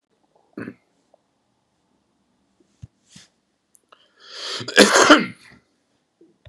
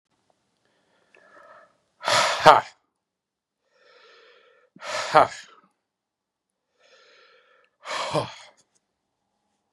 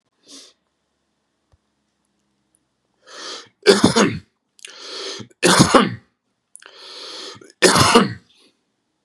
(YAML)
cough_length: 6.5 s
cough_amplitude: 32768
cough_signal_mean_std_ratio: 0.23
exhalation_length: 9.7 s
exhalation_amplitude: 32768
exhalation_signal_mean_std_ratio: 0.22
three_cough_length: 9.0 s
three_cough_amplitude: 32768
three_cough_signal_mean_std_ratio: 0.33
survey_phase: beta (2021-08-13 to 2022-03-07)
age: 45-64
gender: Male
wearing_mask: 'No'
symptom_none: true
smoker_status: Ex-smoker
respiratory_condition_asthma: false
respiratory_condition_other: false
recruitment_source: REACT
submission_delay: 7 days
covid_test_result: Negative
covid_test_method: RT-qPCR
influenza_a_test_result: Unknown/Void
influenza_b_test_result: Unknown/Void